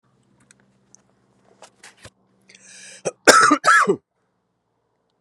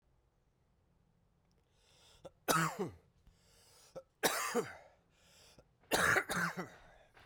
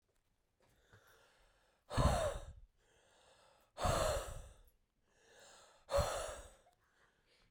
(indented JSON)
{
  "cough_length": "5.2 s",
  "cough_amplitude": 32768,
  "cough_signal_mean_std_ratio": 0.28,
  "three_cough_length": "7.3 s",
  "three_cough_amplitude": 6783,
  "three_cough_signal_mean_std_ratio": 0.37,
  "exhalation_length": "7.5 s",
  "exhalation_amplitude": 3159,
  "exhalation_signal_mean_std_ratio": 0.38,
  "survey_phase": "beta (2021-08-13 to 2022-03-07)",
  "age": "45-64",
  "gender": "Male",
  "wearing_mask": "No",
  "symptom_cough_any": true,
  "symptom_runny_or_blocked_nose": true,
  "symptom_fatigue": true,
  "symptom_fever_high_temperature": true,
  "symptom_headache": true,
  "symptom_change_to_sense_of_smell_or_taste": true,
  "symptom_onset": "4 days",
  "smoker_status": "Never smoked",
  "respiratory_condition_asthma": false,
  "respiratory_condition_other": false,
  "recruitment_source": "Test and Trace",
  "submission_delay": "2 days",
  "covid_test_result": "Positive",
  "covid_test_method": "RT-qPCR"
}